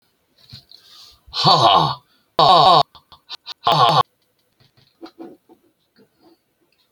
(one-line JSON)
{"exhalation_length": "6.9 s", "exhalation_amplitude": 31034, "exhalation_signal_mean_std_ratio": 0.38, "survey_phase": "beta (2021-08-13 to 2022-03-07)", "age": "65+", "gender": "Male", "wearing_mask": "No", "symptom_none": true, "smoker_status": "Ex-smoker", "respiratory_condition_asthma": false, "respiratory_condition_other": false, "recruitment_source": "REACT", "submission_delay": "1 day", "covid_test_result": "Negative", "covid_test_method": "RT-qPCR"}